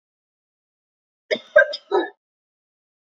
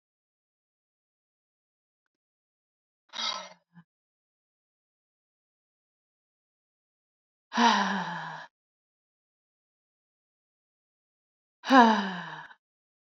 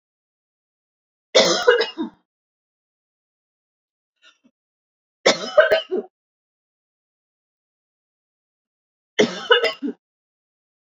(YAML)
cough_length: 3.2 s
cough_amplitude: 27099
cough_signal_mean_std_ratio: 0.24
exhalation_length: 13.1 s
exhalation_amplitude: 19159
exhalation_signal_mean_std_ratio: 0.22
three_cough_length: 10.9 s
three_cough_amplitude: 29196
three_cough_signal_mean_std_ratio: 0.27
survey_phase: beta (2021-08-13 to 2022-03-07)
age: 18-44
gender: Female
wearing_mask: 'No'
symptom_cough_any: true
symptom_new_continuous_cough: true
symptom_sore_throat: true
symptom_onset: 2 days
smoker_status: Never smoked
respiratory_condition_asthma: false
respiratory_condition_other: false
recruitment_source: Test and Trace
submission_delay: 1 day
covid_test_result: Negative
covid_test_method: RT-qPCR